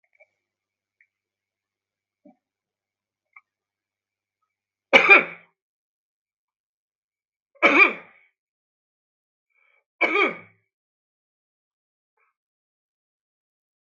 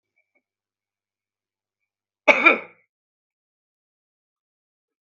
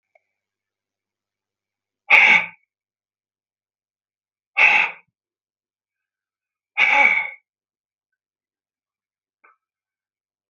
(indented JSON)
{
  "three_cough_length": "13.9 s",
  "three_cough_amplitude": 32768,
  "three_cough_signal_mean_std_ratio": 0.18,
  "cough_length": "5.1 s",
  "cough_amplitude": 32768,
  "cough_signal_mean_std_ratio": 0.16,
  "exhalation_length": "10.5 s",
  "exhalation_amplitude": 32768,
  "exhalation_signal_mean_std_ratio": 0.26,
  "survey_phase": "beta (2021-08-13 to 2022-03-07)",
  "age": "65+",
  "gender": "Male",
  "wearing_mask": "No",
  "symptom_shortness_of_breath": true,
  "smoker_status": "Never smoked",
  "respiratory_condition_asthma": true,
  "respiratory_condition_other": false,
  "recruitment_source": "REACT",
  "submission_delay": "2 days",
  "covid_test_result": "Negative",
  "covid_test_method": "RT-qPCR"
}